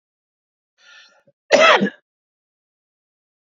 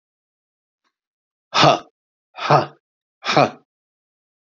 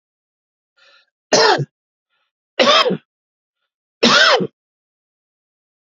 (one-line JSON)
{"cough_length": "3.5 s", "cough_amplitude": 29504, "cough_signal_mean_std_ratio": 0.26, "exhalation_length": "4.5 s", "exhalation_amplitude": 28101, "exhalation_signal_mean_std_ratio": 0.29, "three_cough_length": "6.0 s", "three_cough_amplitude": 32089, "three_cough_signal_mean_std_ratio": 0.35, "survey_phase": "beta (2021-08-13 to 2022-03-07)", "age": "45-64", "gender": "Male", "wearing_mask": "No", "symptom_none": true, "smoker_status": "Ex-smoker", "respiratory_condition_asthma": false, "respiratory_condition_other": false, "recruitment_source": "REACT", "submission_delay": "2 days", "covid_test_result": "Positive", "covid_test_method": "RT-qPCR", "covid_ct_value": 20.0, "covid_ct_gene": "E gene", "influenza_a_test_result": "Negative", "influenza_b_test_result": "Negative"}